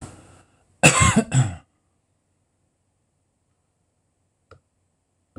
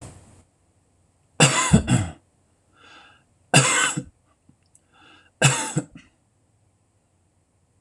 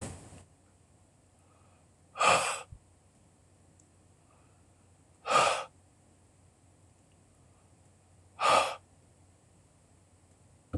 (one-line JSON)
{"cough_length": "5.4 s", "cough_amplitude": 26028, "cough_signal_mean_std_ratio": 0.26, "three_cough_length": "7.8 s", "three_cough_amplitude": 26028, "three_cough_signal_mean_std_ratio": 0.33, "exhalation_length": "10.8 s", "exhalation_amplitude": 9822, "exhalation_signal_mean_std_ratio": 0.28, "survey_phase": "beta (2021-08-13 to 2022-03-07)", "age": "65+", "gender": "Male", "wearing_mask": "No", "symptom_none": true, "symptom_onset": "6 days", "smoker_status": "Never smoked", "respiratory_condition_asthma": true, "respiratory_condition_other": false, "recruitment_source": "REACT", "submission_delay": "1 day", "covid_test_result": "Positive", "covid_test_method": "RT-qPCR", "covid_ct_value": 27.0, "covid_ct_gene": "E gene", "influenza_a_test_result": "Negative", "influenza_b_test_result": "Negative"}